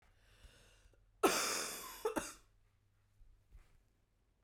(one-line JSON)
{"cough_length": "4.4 s", "cough_amplitude": 4890, "cough_signal_mean_std_ratio": 0.34, "survey_phase": "beta (2021-08-13 to 2022-03-07)", "age": "45-64", "gender": "Female", "wearing_mask": "No", "symptom_cough_any": true, "symptom_new_continuous_cough": true, "symptom_fatigue": true, "symptom_fever_high_temperature": true, "symptom_headache": true, "symptom_onset": "3 days", "smoker_status": "Never smoked", "respiratory_condition_asthma": false, "respiratory_condition_other": false, "recruitment_source": "Test and Trace", "submission_delay": "2 days", "covid_test_result": "Positive", "covid_test_method": "RT-qPCR", "covid_ct_value": 31.3, "covid_ct_gene": "ORF1ab gene", "covid_ct_mean": 32.0, "covid_viral_load": "33 copies/ml", "covid_viral_load_category": "Minimal viral load (< 10K copies/ml)"}